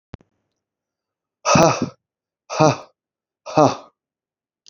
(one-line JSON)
{"exhalation_length": "4.7 s", "exhalation_amplitude": 29205, "exhalation_signal_mean_std_ratio": 0.3, "survey_phase": "beta (2021-08-13 to 2022-03-07)", "age": "65+", "gender": "Male", "wearing_mask": "No", "symptom_cough_any": true, "symptom_fever_high_temperature": true, "symptom_headache": true, "symptom_onset": "4 days", "smoker_status": "Ex-smoker", "respiratory_condition_asthma": false, "respiratory_condition_other": false, "recruitment_source": "Test and Trace", "submission_delay": "2 days", "covid_test_result": "Positive", "covid_test_method": "RT-qPCR", "covid_ct_value": 12.7, "covid_ct_gene": "ORF1ab gene", "covid_ct_mean": 13.2, "covid_viral_load": "47000000 copies/ml", "covid_viral_load_category": "High viral load (>1M copies/ml)"}